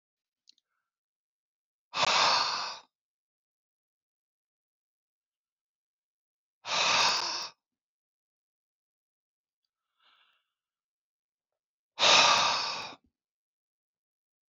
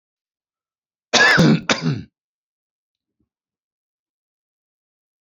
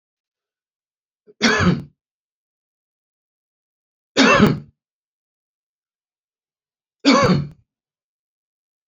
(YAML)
exhalation_length: 14.5 s
exhalation_amplitude: 13630
exhalation_signal_mean_std_ratio: 0.3
cough_length: 5.2 s
cough_amplitude: 30127
cough_signal_mean_std_ratio: 0.3
three_cough_length: 8.9 s
three_cough_amplitude: 29387
three_cough_signal_mean_std_ratio: 0.29
survey_phase: beta (2021-08-13 to 2022-03-07)
age: 65+
gender: Male
wearing_mask: 'No'
symptom_none: true
smoker_status: Never smoked
respiratory_condition_asthma: false
respiratory_condition_other: false
recruitment_source: REACT
submission_delay: 1 day
covid_test_result: Negative
covid_test_method: RT-qPCR
influenza_a_test_result: Negative
influenza_b_test_result: Negative